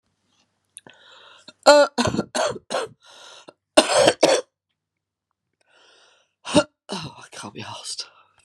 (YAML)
three_cough_length: 8.4 s
three_cough_amplitude: 32768
three_cough_signal_mean_std_ratio: 0.32
survey_phase: beta (2021-08-13 to 2022-03-07)
age: 45-64
gender: Female
wearing_mask: 'No'
symptom_cough_any: true
symptom_runny_or_blocked_nose: true
symptom_abdominal_pain: true
symptom_diarrhoea: true
symptom_fatigue: true
symptom_headache: true
symptom_loss_of_taste: true
symptom_onset: 3 days
smoker_status: Ex-smoker
respiratory_condition_asthma: false
respiratory_condition_other: false
recruitment_source: Test and Trace
submission_delay: 2 days
covid_test_result: Positive
covid_test_method: RT-qPCR
covid_ct_value: 14.9
covid_ct_gene: ORF1ab gene
covid_ct_mean: 15.2
covid_viral_load: 11000000 copies/ml
covid_viral_load_category: High viral load (>1M copies/ml)